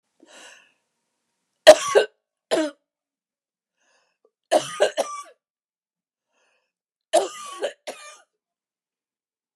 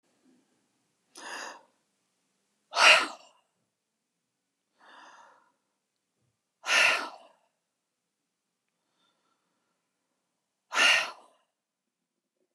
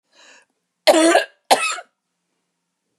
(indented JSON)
{
  "three_cough_length": "9.6 s",
  "three_cough_amplitude": 32768,
  "three_cough_signal_mean_std_ratio": 0.22,
  "exhalation_length": "12.5 s",
  "exhalation_amplitude": 20299,
  "exhalation_signal_mean_std_ratio": 0.23,
  "cough_length": "3.0 s",
  "cough_amplitude": 32021,
  "cough_signal_mean_std_ratio": 0.35,
  "survey_phase": "beta (2021-08-13 to 2022-03-07)",
  "age": "45-64",
  "gender": "Female",
  "wearing_mask": "No",
  "symptom_cough_any": true,
  "smoker_status": "Never smoked",
  "respiratory_condition_asthma": false,
  "respiratory_condition_other": false,
  "recruitment_source": "REACT",
  "submission_delay": "3 days",
  "covid_test_result": "Negative",
  "covid_test_method": "RT-qPCR",
  "influenza_a_test_result": "Negative",
  "influenza_b_test_result": "Negative"
}